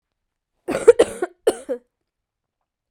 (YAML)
cough_length: 2.9 s
cough_amplitude: 32768
cough_signal_mean_std_ratio: 0.24
survey_phase: beta (2021-08-13 to 2022-03-07)
age: 45-64
gender: Female
wearing_mask: 'No'
symptom_cough_any: true
symptom_fatigue: true
symptom_headache: true
symptom_other: true
symptom_onset: 5 days
smoker_status: Never smoked
respiratory_condition_asthma: false
respiratory_condition_other: false
recruitment_source: Test and Trace
submission_delay: 2 days
covid_test_result: Positive
covid_test_method: RT-qPCR
covid_ct_value: 14.2
covid_ct_gene: N gene